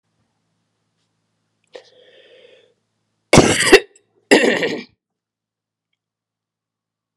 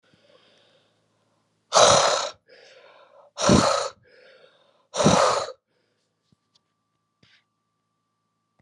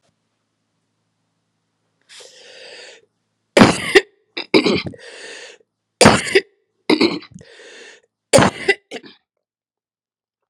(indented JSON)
{
  "cough_length": "7.2 s",
  "cough_amplitude": 32768,
  "cough_signal_mean_std_ratio": 0.25,
  "exhalation_length": "8.6 s",
  "exhalation_amplitude": 29145,
  "exhalation_signal_mean_std_ratio": 0.33,
  "three_cough_length": "10.5 s",
  "three_cough_amplitude": 32768,
  "three_cough_signal_mean_std_ratio": 0.29,
  "survey_phase": "alpha (2021-03-01 to 2021-08-12)",
  "age": "45-64",
  "gender": "Female",
  "wearing_mask": "No",
  "symptom_fatigue": true,
  "symptom_fever_high_temperature": true,
  "symptom_headache": true,
  "symptom_onset": "3 days",
  "smoker_status": "Never smoked",
  "respiratory_condition_asthma": false,
  "respiratory_condition_other": false,
  "recruitment_source": "Test and Trace",
  "submission_delay": "1 day",
  "covid_test_result": "Positive",
  "covid_test_method": "RT-qPCR",
  "covid_ct_value": 24.2,
  "covid_ct_gene": "ORF1ab gene"
}